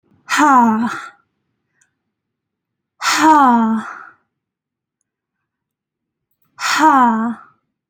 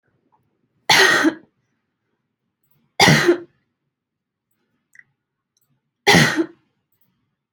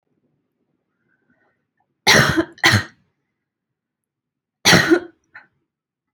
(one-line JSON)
{"exhalation_length": "7.9 s", "exhalation_amplitude": 28629, "exhalation_signal_mean_std_ratio": 0.45, "three_cough_length": "7.5 s", "three_cough_amplitude": 31747, "three_cough_signal_mean_std_ratio": 0.31, "cough_length": "6.1 s", "cough_amplitude": 32242, "cough_signal_mean_std_ratio": 0.3, "survey_phase": "alpha (2021-03-01 to 2021-08-12)", "age": "18-44", "gender": "Female", "wearing_mask": "No", "symptom_cough_any": true, "symptom_fatigue": true, "symptom_headache": true, "symptom_change_to_sense_of_smell_or_taste": true, "symptom_onset": "3 days", "smoker_status": "Never smoked", "respiratory_condition_asthma": false, "respiratory_condition_other": false, "recruitment_source": "Test and Trace", "submission_delay": "2 days", "covid_test_result": "Positive", "covid_test_method": "RT-qPCR", "covid_ct_value": 34.9, "covid_ct_gene": "N gene"}